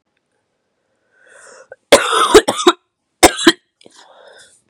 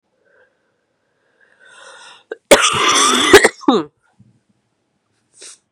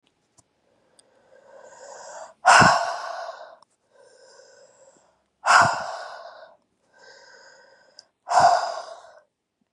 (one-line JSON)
{"three_cough_length": "4.7 s", "three_cough_amplitude": 32768, "three_cough_signal_mean_std_ratio": 0.31, "cough_length": "5.7 s", "cough_amplitude": 32768, "cough_signal_mean_std_ratio": 0.34, "exhalation_length": "9.7 s", "exhalation_amplitude": 31707, "exhalation_signal_mean_std_ratio": 0.32, "survey_phase": "beta (2021-08-13 to 2022-03-07)", "age": "18-44", "gender": "Female", "wearing_mask": "No", "symptom_cough_any": true, "symptom_runny_or_blocked_nose": true, "symptom_shortness_of_breath": true, "symptom_sore_throat": true, "symptom_abdominal_pain": true, "symptom_fatigue": true, "symptom_fever_high_temperature": true, "symptom_headache": true, "symptom_change_to_sense_of_smell_or_taste": true, "symptom_loss_of_taste": true, "symptom_onset": "3 days", "smoker_status": "Ex-smoker", "respiratory_condition_asthma": false, "respiratory_condition_other": false, "recruitment_source": "Test and Trace", "submission_delay": "1 day", "covid_test_result": "Positive", "covid_test_method": "ePCR"}